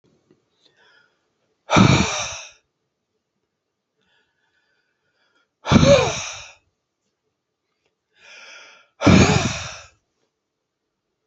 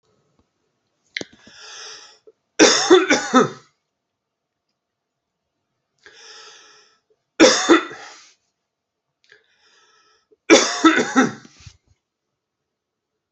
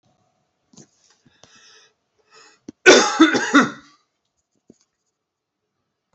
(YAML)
exhalation_length: 11.3 s
exhalation_amplitude: 28847
exhalation_signal_mean_std_ratio: 0.29
three_cough_length: 13.3 s
three_cough_amplitude: 32767
three_cough_signal_mean_std_ratio: 0.29
cough_length: 6.1 s
cough_amplitude: 30807
cough_signal_mean_std_ratio: 0.26
survey_phase: alpha (2021-03-01 to 2021-08-12)
age: 45-64
gender: Male
wearing_mask: 'No'
symptom_change_to_sense_of_smell_or_taste: true
symptom_onset: 13 days
smoker_status: Never smoked
respiratory_condition_asthma: false
respiratory_condition_other: false
recruitment_source: REACT
submission_delay: 1 day
covid_test_result: Negative
covid_test_method: RT-qPCR